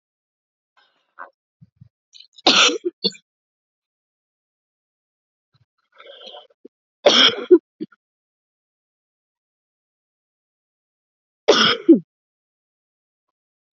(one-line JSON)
{"three_cough_length": "13.7 s", "three_cough_amplitude": 30331, "three_cough_signal_mean_std_ratio": 0.22, "survey_phase": "alpha (2021-03-01 to 2021-08-12)", "age": "45-64", "gender": "Female", "wearing_mask": "No", "symptom_none": true, "smoker_status": "Never smoked", "respiratory_condition_asthma": false, "respiratory_condition_other": false, "recruitment_source": "REACT", "submission_delay": "1 day", "covid_test_result": "Negative", "covid_test_method": "RT-qPCR"}